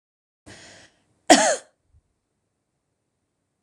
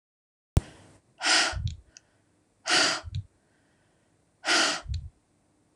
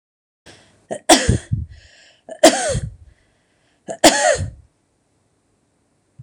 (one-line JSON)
{"cough_length": "3.6 s", "cough_amplitude": 26028, "cough_signal_mean_std_ratio": 0.2, "exhalation_length": "5.8 s", "exhalation_amplitude": 14867, "exhalation_signal_mean_std_ratio": 0.39, "three_cough_length": "6.2 s", "three_cough_amplitude": 26028, "three_cough_signal_mean_std_ratio": 0.33, "survey_phase": "alpha (2021-03-01 to 2021-08-12)", "age": "45-64", "gender": "Female", "wearing_mask": "No", "symptom_none": true, "smoker_status": "Never smoked", "respiratory_condition_asthma": false, "respiratory_condition_other": false, "recruitment_source": "REACT", "submission_delay": "2 days", "covid_test_result": "Negative", "covid_test_method": "RT-qPCR"}